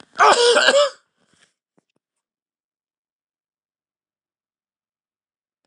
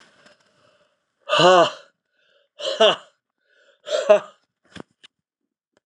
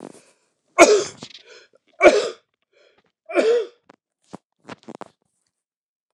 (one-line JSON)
{"cough_length": "5.7 s", "cough_amplitude": 29204, "cough_signal_mean_std_ratio": 0.28, "exhalation_length": "5.9 s", "exhalation_amplitude": 28987, "exhalation_signal_mean_std_ratio": 0.31, "three_cough_length": "6.1 s", "three_cough_amplitude": 29204, "three_cough_signal_mean_std_ratio": 0.29, "survey_phase": "beta (2021-08-13 to 2022-03-07)", "age": "65+", "gender": "Male", "wearing_mask": "No", "symptom_cough_any": true, "symptom_runny_or_blocked_nose": true, "symptom_sore_throat": true, "symptom_headache": true, "symptom_onset": "4 days", "smoker_status": "Ex-smoker", "respiratory_condition_asthma": false, "respiratory_condition_other": false, "recruitment_source": "Test and Trace", "submission_delay": "1 day", "covid_test_result": "Negative", "covid_test_method": "ePCR"}